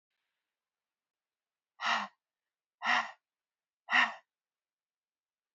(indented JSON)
{
  "exhalation_length": "5.5 s",
  "exhalation_amplitude": 6606,
  "exhalation_signal_mean_std_ratio": 0.26,
  "survey_phase": "beta (2021-08-13 to 2022-03-07)",
  "age": "45-64",
  "gender": "Female",
  "wearing_mask": "No",
  "symptom_cough_any": true,
  "symptom_runny_or_blocked_nose": true,
  "symptom_fatigue": true,
  "symptom_headache": true,
  "symptom_other": true,
  "symptom_onset": "3 days",
  "smoker_status": "Ex-smoker",
  "respiratory_condition_asthma": false,
  "respiratory_condition_other": false,
  "recruitment_source": "Test and Trace",
  "submission_delay": "1 day",
  "covid_test_result": "Positive",
  "covid_test_method": "RT-qPCR",
  "covid_ct_value": 20.7,
  "covid_ct_gene": "N gene"
}